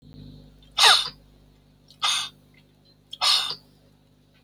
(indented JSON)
{
  "exhalation_length": "4.4 s",
  "exhalation_amplitude": 24608,
  "exhalation_signal_mean_std_ratio": 0.35,
  "survey_phase": "beta (2021-08-13 to 2022-03-07)",
  "age": "45-64",
  "gender": "Male",
  "wearing_mask": "No",
  "symptom_cough_any": true,
  "symptom_diarrhoea": true,
  "smoker_status": "Ex-smoker",
  "respiratory_condition_asthma": false,
  "respiratory_condition_other": false,
  "recruitment_source": "REACT",
  "submission_delay": "0 days",
  "covid_test_result": "Negative",
  "covid_test_method": "RT-qPCR"
}